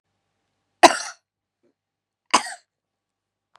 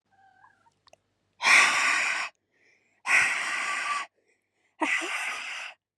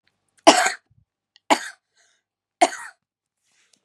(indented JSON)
{
  "cough_length": "3.6 s",
  "cough_amplitude": 32768,
  "cough_signal_mean_std_ratio": 0.17,
  "exhalation_length": "6.0 s",
  "exhalation_amplitude": 15170,
  "exhalation_signal_mean_std_ratio": 0.5,
  "three_cough_length": "3.8 s",
  "three_cough_amplitude": 32767,
  "three_cough_signal_mean_std_ratio": 0.24,
  "survey_phase": "beta (2021-08-13 to 2022-03-07)",
  "age": "18-44",
  "gender": "Female",
  "wearing_mask": "No",
  "symptom_none": true,
  "smoker_status": "Current smoker (1 to 10 cigarettes per day)",
  "respiratory_condition_asthma": false,
  "respiratory_condition_other": false,
  "recruitment_source": "REACT",
  "submission_delay": "2 days",
  "covid_test_result": "Negative",
  "covid_test_method": "RT-qPCR",
  "influenza_a_test_result": "Negative",
  "influenza_b_test_result": "Negative"
}